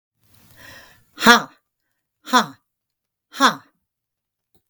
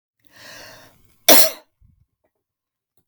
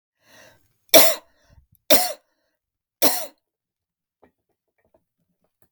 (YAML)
exhalation_length: 4.7 s
exhalation_amplitude: 32766
exhalation_signal_mean_std_ratio: 0.24
cough_length: 3.1 s
cough_amplitude: 32768
cough_signal_mean_std_ratio: 0.23
three_cough_length: 5.7 s
three_cough_amplitude: 32768
three_cough_signal_mean_std_ratio: 0.23
survey_phase: beta (2021-08-13 to 2022-03-07)
age: 65+
gender: Female
wearing_mask: 'No'
symptom_none: true
smoker_status: Never smoked
respiratory_condition_asthma: false
respiratory_condition_other: false
recruitment_source: REACT
submission_delay: 1 day
covid_test_result: Negative
covid_test_method: RT-qPCR
influenza_a_test_result: Negative
influenza_b_test_result: Negative